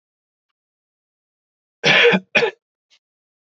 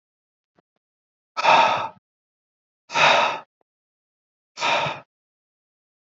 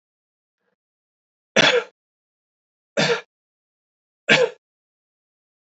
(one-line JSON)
{"cough_length": "3.6 s", "cough_amplitude": 27326, "cough_signal_mean_std_ratio": 0.3, "exhalation_length": "6.1 s", "exhalation_amplitude": 25199, "exhalation_signal_mean_std_ratio": 0.35, "three_cough_length": "5.7 s", "three_cough_amplitude": 26807, "three_cough_signal_mean_std_ratio": 0.26, "survey_phase": "beta (2021-08-13 to 2022-03-07)", "age": "18-44", "gender": "Male", "wearing_mask": "No", "symptom_none": true, "smoker_status": "Never smoked", "respiratory_condition_asthma": true, "respiratory_condition_other": false, "recruitment_source": "Test and Trace", "submission_delay": "2 days", "covid_test_result": "Positive", "covid_test_method": "RT-qPCR", "covid_ct_value": 24.7, "covid_ct_gene": "ORF1ab gene", "covid_ct_mean": 25.3, "covid_viral_load": "5200 copies/ml", "covid_viral_load_category": "Minimal viral load (< 10K copies/ml)"}